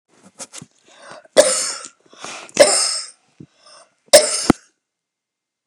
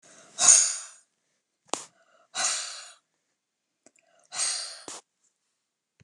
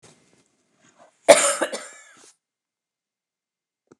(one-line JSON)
{"three_cough_length": "5.7 s", "three_cough_amplitude": 29204, "three_cough_signal_mean_std_ratio": 0.32, "exhalation_length": "6.0 s", "exhalation_amplitude": 25848, "exhalation_signal_mean_std_ratio": 0.29, "cough_length": "4.0 s", "cough_amplitude": 29204, "cough_signal_mean_std_ratio": 0.21, "survey_phase": "beta (2021-08-13 to 2022-03-07)", "age": "45-64", "gender": "Female", "wearing_mask": "No", "symptom_none": true, "smoker_status": "Never smoked", "respiratory_condition_asthma": false, "respiratory_condition_other": false, "recruitment_source": "REACT", "submission_delay": "2 days", "covid_test_result": "Negative", "covid_test_method": "RT-qPCR", "influenza_a_test_result": "Negative", "influenza_b_test_result": "Negative"}